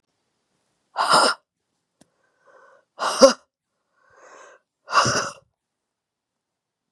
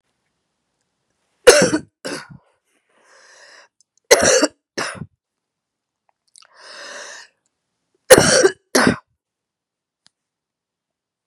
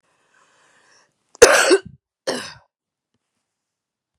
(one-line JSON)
{"exhalation_length": "6.9 s", "exhalation_amplitude": 32767, "exhalation_signal_mean_std_ratio": 0.27, "three_cough_length": "11.3 s", "three_cough_amplitude": 32768, "three_cough_signal_mean_std_ratio": 0.27, "cough_length": "4.2 s", "cough_amplitude": 32768, "cough_signal_mean_std_ratio": 0.25, "survey_phase": "beta (2021-08-13 to 2022-03-07)", "age": "45-64", "gender": "Female", "wearing_mask": "No", "symptom_cough_any": true, "symptom_runny_or_blocked_nose": true, "symptom_other": true, "smoker_status": "Never smoked", "respiratory_condition_asthma": false, "respiratory_condition_other": false, "recruitment_source": "Test and Trace", "submission_delay": "2 days", "covid_test_result": "Positive", "covid_test_method": "LFT"}